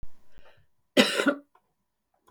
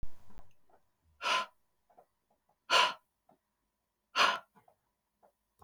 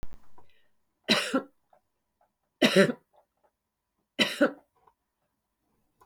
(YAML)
cough_length: 2.3 s
cough_amplitude: 22738
cough_signal_mean_std_ratio: 0.35
exhalation_length: 5.6 s
exhalation_amplitude: 7539
exhalation_signal_mean_std_ratio: 0.33
three_cough_length: 6.1 s
three_cough_amplitude: 15025
three_cough_signal_mean_std_ratio: 0.3
survey_phase: beta (2021-08-13 to 2022-03-07)
age: 65+
gender: Female
wearing_mask: 'No'
symptom_none: true
smoker_status: Never smoked
respiratory_condition_asthma: false
respiratory_condition_other: false
recruitment_source: REACT
submission_delay: 2 days
covid_test_result: Negative
covid_test_method: RT-qPCR
influenza_a_test_result: Negative
influenza_b_test_result: Negative